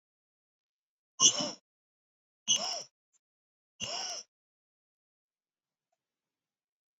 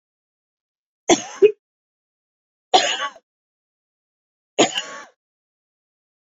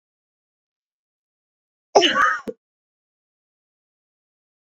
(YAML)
exhalation_length: 7.0 s
exhalation_amplitude: 12598
exhalation_signal_mean_std_ratio: 0.23
three_cough_length: 6.2 s
three_cough_amplitude: 31630
three_cough_signal_mean_std_ratio: 0.24
cough_length: 4.7 s
cough_amplitude: 28134
cough_signal_mean_std_ratio: 0.23
survey_phase: beta (2021-08-13 to 2022-03-07)
age: 45-64
gender: Female
wearing_mask: 'No'
symptom_cough_any: true
symptom_runny_or_blocked_nose: true
symptom_fatigue: true
symptom_change_to_sense_of_smell_or_taste: true
symptom_loss_of_taste: true
symptom_onset: 3 days
smoker_status: Never smoked
respiratory_condition_asthma: false
respiratory_condition_other: false
recruitment_source: Test and Trace
submission_delay: 2 days
covid_test_result: Positive
covid_test_method: RT-qPCR
covid_ct_value: 14.8
covid_ct_gene: ORF1ab gene
covid_ct_mean: 15.3
covid_viral_load: 9300000 copies/ml
covid_viral_load_category: High viral load (>1M copies/ml)